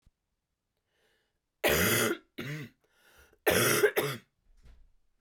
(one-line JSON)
{"three_cough_length": "5.2 s", "three_cough_amplitude": 10240, "three_cough_signal_mean_std_ratio": 0.41, "survey_phase": "beta (2021-08-13 to 2022-03-07)", "age": "18-44", "gender": "Female", "wearing_mask": "No", "symptom_cough_any": true, "symptom_new_continuous_cough": true, "symptom_runny_or_blocked_nose": true, "symptom_fatigue": true, "symptom_fever_high_temperature": true, "symptom_change_to_sense_of_smell_or_taste": true, "symptom_onset": "3 days", "smoker_status": "Never smoked", "respiratory_condition_asthma": true, "respiratory_condition_other": false, "recruitment_source": "Test and Trace", "submission_delay": "1 day", "covid_test_result": "Positive", "covid_test_method": "RT-qPCR", "covid_ct_value": 25.1, "covid_ct_gene": "ORF1ab gene", "covid_ct_mean": 28.9, "covid_viral_load": "320 copies/ml", "covid_viral_load_category": "Minimal viral load (< 10K copies/ml)"}